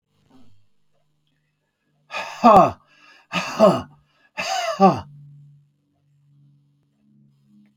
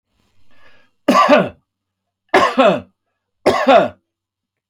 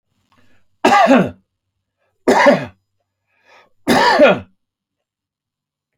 {"exhalation_length": "7.8 s", "exhalation_amplitude": 27834, "exhalation_signal_mean_std_ratio": 0.3, "three_cough_length": "4.7 s", "three_cough_amplitude": 31260, "three_cough_signal_mean_std_ratio": 0.42, "cough_length": "6.0 s", "cough_amplitude": 32564, "cough_signal_mean_std_ratio": 0.39, "survey_phase": "alpha (2021-03-01 to 2021-08-12)", "age": "65+", "gender": "Male", "wearing_mask": "No", "symptom_none": true, "smoker_status": "Never smoked", "respiratory_condition_asthma": false, "respiratory_condition_other": false, "recruitment_source": "REACT", "submission_delay": "2 days", "covid_test_result": "Negative", "covid_test_method": "RT-qPCR"}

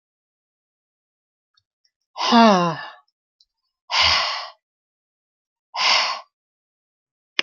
{"exhalation_length": "7.4 s", "exhalation_amplitude": 27565, "exhalation_signal_mean_std_ratio": 0.34, "survey_phase": "alpha (2021-03-01 to 2021-08-12)", "age": "45-64", "gender": "Female", "wearing_mask": "No", "symptom_none": true, "smoker_status": "Never smoked", "respiratory_condition_asthma": false, "respiratory_condition_other": false, "recruitment_source": "REACT", "submission_delay": "2 days", "covid_test_result": "Negative", "covid_test_method": "RT-qPCR"}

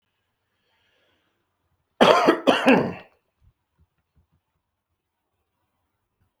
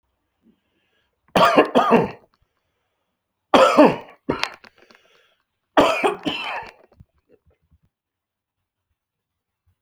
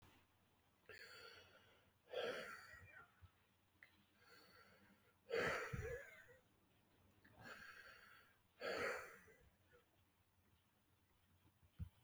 {"cough_length": "6.4 s", "cough_amplitude": 32766, "cough_signal_mean_std_ratio": 0.26, "three_cough_length": "9.8 s", "three_cough_amplitude": 32766, "three_cough_signal_mean_std_ratio": 0.31, "exhalation_length": "12.0 s", "exhalation_amplitude": 985, "exhalation_signal_mean_std_ratio": 0.42, "survey_phase": "beta (2021-08-13 to 2022-03-07)", "age": "45-64", "gender": "Male", "wearing_mask": "No", "symptom_cough_any": true, "symptom_sore_throat": true, "symptom_onset": "5 days", "smoker_status": "Ex-smoker", "respiratory_condition_asthma": false, "respiratory_condition_other": false, "recruitment_source": "REACT", "submission_delay": "1 day", "covid_test_result": "Negative", "covid_test_method": "RT-qPCR", "influenza_a_test_result": "Negative", "influenza_b_test_result": "Negative"}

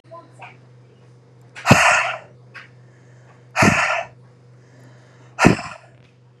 {"exhalation_length": "6.4 s", "exhalation_amplitude": 32768, "exhalation_signal_mean_std_ratio": 0.36, "survey_phase": "beta (2021-08-13 to 2022-03-07)", "age": "18-44", "gender": "Female", "wearing_mask": "No", "symptom_runny_or_blocked_nose": true, "symptom_fatigue": true, "smoker_status": "Ex-smoker", "respiratory_condition_asthma": false, "respiratory_condition_other": false, "recruitment_source": "REACT", "submission_delay": "1 day", "covid_test_result": "Negative", "covid_test_method": "RT-qPCR", "influenza_a_test_result": "Negative", "influenza_b_test_result": "Negative"}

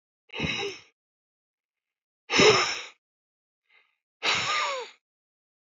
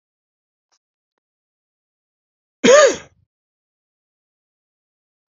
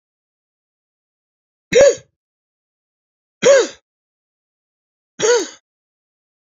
{"exhalation_length": "5.7 s", "exhalation_amplitude": 16307, "exhalation_signal_mean_std_ratio": 0.36, "cough_length": "5.3 s", "cough_amplitude": 29607, "cough_signal_mean_std_ratio": 0.2, "three_cough_length": "6.6 s", "three_cough_amplitude": 29619, "three_cough_signal_mean_std_ratio": 0.26, "survey_phase": "beta (2021-08-13 to 2022-03-07)", "age": "45-64", "gender": "Male", "wearing_mask": "No", "symptom_none": true, "smoker_status": "Never smoked", "respiratory_condition_asthma": false, "respiratory_condition_other": false, "recruitment_source": "REACT", "submission_delay": "1 day", "covid_test_result": "Negative", "covid_test_method": "RT-qPCR", "influenza_a_test_result": "Negative", "influenza_b_test_result": "Negative"}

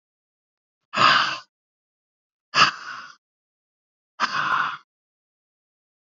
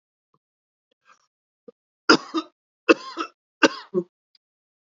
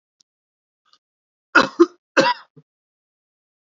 {"exhalation_length": "6.1 s", "exhalation_amplitude": 26750, "exhalation_signal_mean_std_ratio": 0.32, "three_cough_length": "4.9 s", "three_cough_amplitude": 28448, "three_cough_signal_mean_std_ratio": 0.21, "cough_length": "3.8 s", "cough_amplitude": 28982, "cough_signal_mean_std_ratio": 0.23, "survey_phase": "beta (2021-08-13 to 2022-03-07)", "age": "65+", "gender": "Male", "wearing_mask": "No", "symptom_runny_or_blocked_nose": true, "smoker_status": "Ex-smoker", "respiratory_condition_asthma": false, "respiratory_condition_other": false, "recruitment_source": "Test and Trace", "submission_delay": "0 days", "covid_test_result": "Positive", "covid_test_method": "LFT"}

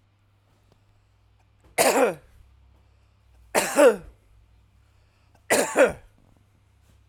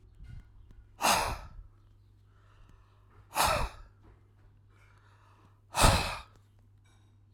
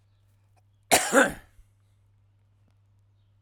{"three_cough_length": "7.1 s", "three_cough_amplitude": 23791, "three_cough_signal_mean_std_ratio": 0.32, "exhalation_length": "7.3 s", "exhalation_amplitude": 16099, "exhalation_signal_mean_std_ratio": 0.34, "cough_length": "3.4 s", "cough_amplitude": 18171, "cough_signal_mean_std_ratio": 0.25, "survey_phase": "alpha (2021-03-01 to 2021-08-12)", "age": "45-64", "gender": "Male", "wearing_mask": "No", "symptom_none": true, "smoker_status": "Never smoked", "respiratory_condition_asthma": false, "respiratory_condition_other": false, "recruitment_source": "REACT", "submission_delay": "3 days", "covid_test_result": "Negative", "covid_test_method": "RT-qPCR"}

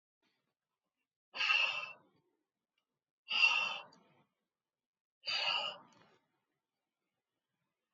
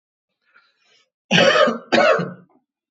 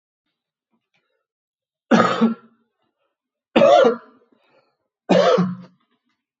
{"exhalation_length": "7.9 s", "exhalation_amplitude": 4813, "exhalation_signal_mean_std_ratio": 0.33, "cough_length": "2.9 s", "cough_amplitude": 27863, "cough_signal_mean_std_ratio": 0.44, "three_cough_length": "6.4 s", "three_cough_amplitude": 29968, "three_cough_signal_mean_std_ratio": 0.36, "survey_phase": "alpha (2021-03-01 to 2021-08-12)", "age": "18-44", "gender": "Male", "wearing_mask": "No", "symptom_none": true, "smoker_status": "Ex-smoker", "respiratory_condition_asthma": false, "respiratory_condition_other": false, "recruitment_source": "REACT", "submission_delay": "2 days", "covid_test_result": "Negative", "covid_test_method": "RT-qPCR"}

